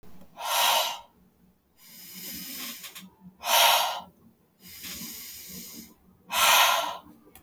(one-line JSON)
{"exhalation_length": "7.4 s", "exhalation_amplitude": 15477, "exhalation_signal_mean_std_ratio": 0.47, "survey_phase": "beta (2021-08-13 to 2022-03-07)", "age": "18-44", "gender": "Female", "wearing_mask": "No", "symptom_none": true, "smoker_status": "Never smoked", "respiratory_condition_asthma": false, "respiratory_condition_other": false, "recruitment_source": "REACT", "submission_delay": "1 day", "covid_test_result": "Negative", "covid_test_method": "RT-qPCR"}